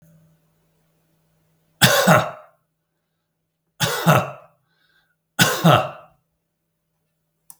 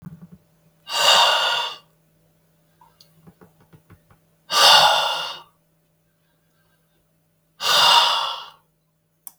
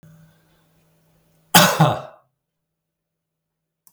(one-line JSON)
{"three_cough_length": "7.6 s", "three_cough_amplitude": 32768, "three_cough_signal_mean_std_ratio": 0.32, "exhalation_length": "9.4 s", "exhalation_amplitude": 32766, "exhalation_signal_mean_std_ratio": 0.4, "cough_length": "3.9 s", "cough_amplitude": 32768, "cough_signal_mean_std_ratio": 0.25, "survey_phase": "beta (2021-08-13 to 2022-03-07)", "age": "45-64", "gender": "Male", "wearing_mask": "No", "symptom_none": true, "smoker_status": "Never smoked", "respiratory_condition_asthma": false, "respiratory_condition_other": false, "recruitment_source": "REACT", "submission_delay": "2 days", "covid_test_result": "Negative", "covid_test_method": "RT-qPCR", "influenza_a_test_result": "Negative", "influenza_b_test_result": "Negative"}